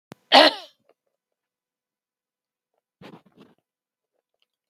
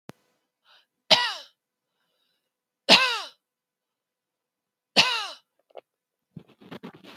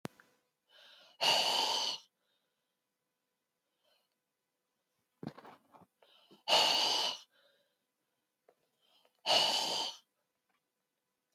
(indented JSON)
{
  "cough_length": "4.7 s",
  "cough_amplitude": 32768,
  "cough_signal_mean_std_ratio": 0.16,
  "three_cough_length": "7.2 s",
  "three_cough_amplitude": 29715,
  "three_cough_signal_mean_std_ratio": 0.24,
  "exhalation_length": "11.3 s",
  "exhalation_amplitude": 6801,
  "exhalation_signal_mean_std_ratio": 0.35,
  "survey_phase": "beta (2021-08-13 to 2022-03-07)",
  "age": "65+",
  "gender": "Female",
  "wearing_mask": "No",
  "symptom_shortness_of_breath": true,
  "symptom_fatigue": true,
  "smoker_status": "Never smoked",
  "respiratory_condition_asthma": false,
  "respiratory_condition_other": false,
  "recruitment_source": "REACT",
  "submission_delay": "1 day",
  "covid_test_result": "Negative",
  "covid_test_method": "RT-qPCR",
  "influenza_a_test_result": "Negative",
  "influenza_b_test_result": "Negative"
}